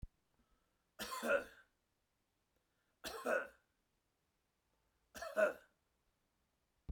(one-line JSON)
{"three_cough_length": "6.9 s", "three_cough_amplitude": 2679, "three_cough_signal_mean_std_ratio": 0.29, "survey_phase": "beta (2021-08-13 to 2022-03-07)", "age": "45-64", "gender": "Male", "wearing_mask": "No", "symptom_none": true, "smoker_status": "Never smoked", "respiratory_condition_asthma": false, "respiratory_condition_other": false, "recruitment_source": "REACT", "submission_delay": "3 days", "covid_test_result": "Negative", "covid_test_method": "RT-qPCR"}